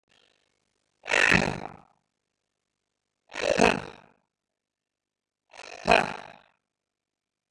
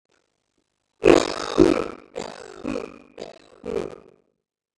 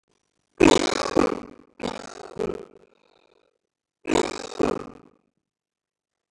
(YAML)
exhalation_length: 7.5 s
exhalation_amplitude: 22336
exhalation_signal_mean_std_ratio: 0.23
cough_length: 4.8 s
cough_amplitude: 30629
cough_signal_mean_std_ratio: 0.28
three_cough_length: 6.3 s
three_cough_amplitude: 25928
three_cough_signal_mean_std_ratio: 0.29
survey_phase: beta (2021-08-13 to 2022-03-07)
age: 45-64
gender: Male
wearing_mask: 'No'
symptom_none: true
smoker_status: Ex-smoker
respiratory_condition_asthma: false
respiratory_condition_other: false
recruitment_source: REACT
submission_delay: 2 days
covid_test_result: Negative
covid_test_method: RT-qPCR
influenza_a_test_result: Unknown/Void
influenza_b_test_result: Unknown/Void